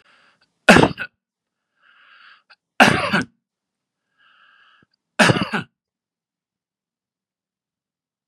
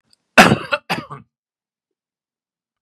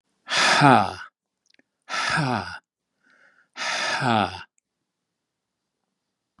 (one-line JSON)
{"three_cough_length": "8.3 s", "three_cough_amplitude": 32768, "three_cough_signal_mean_std_ratio": 0.24, "cough_length": "2.8 s", "cough_amplitude": 32768, "cough_signal_mean_std_ratio": 0.25, "exhalation_length": "6.4 s", "exhalation_amplitude": 31506, "exhalation_signal_mean_std_ratio": 0.39, "survey_phase": "beta (2021-08-13 to 2022-03-07)", "age": "45-64", "gender": "Male", "wearing_mask": "No", "symptom_none": true, "smoker_status": "Never smoked", "respiratory_condition_asthma": false, "respiratory_condition_other": false, "recruitment_source": "REACT", "submission_delay": "1 day", "covid_test_result": "Negative", "covid_test_method": "RT-qPCR", "influenza_a_test_result": "Negative", "influenza_b_test_result": "Negative"}